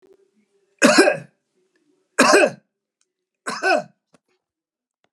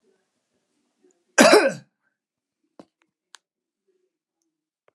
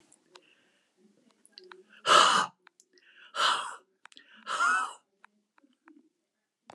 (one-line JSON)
{"three_cough_length": "5.1 s", "three_cough_amplitude": 32050, "three_cough_signal_mean_std_ratio": 0.33, "cough_length": "4.9 s", "cough_amplitude": 32768, "cough_signal_mean_std_ratio": 0.2, "exhalation_length": "6.7 s", "exhalation_amplitude": 14878, "exhalation_signal_mean_std_ratio": 0.32, "survey_phase": "beta (2021-08-13 to 2022-03-07)", "age": "65+", "gender": "Male", "wearing_mask": "No", "symptom_none": true, "smoker_status": "Never smoked", "respiratory_condition_asthma": false, "respiratory_condition_other": false, "recruitment_source": "REACT", "submission_delay": "0 days", "covid_test_result": "Negative", "covid_test_method": "RT-qPCR"}